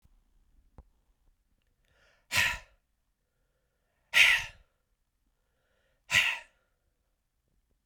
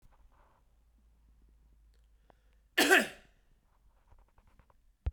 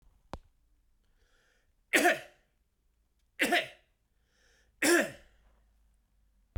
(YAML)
exhalation_length: 7.9 s
exhalation_amplitude: 12926
exhalation_signal_mean_std_ratio: 0.24
cough_length: 5.1 s
cough_amplitude: 10110
cough_signal_mean_std_ratio: 0.22
three_cough_length: 6.6 s
three_cough_amplitude: 9092
three_cough_signal_mean_std_ratio: 0.28
survey_phase: beta (2021-08-13 to 2022-03-07)
age: 45-64
gender: Male
wearing_mask: 'No'
symptom_cough_any: true
symptom_runny_or_blocked_nose: true
symptom_abdominal_pain: true
symptom_fatigue: true
symptom_fever_high_temperature: true
symptom_change_to_sense_of_smell_or_taste: true
symptom_loss_of_taste: true
symptom_onset: 3 days
smoker_status: Never smoked
respiratory_condition_asthma: false
respiratory_condition_other: false
recruitment_source: Test and Trace
submission_delay: 2 days
covid_test_result: Positive
covid_test_method: RT-qPCR
covid_ct_value: 21.3
covid_ct_gene: ORF1ab gene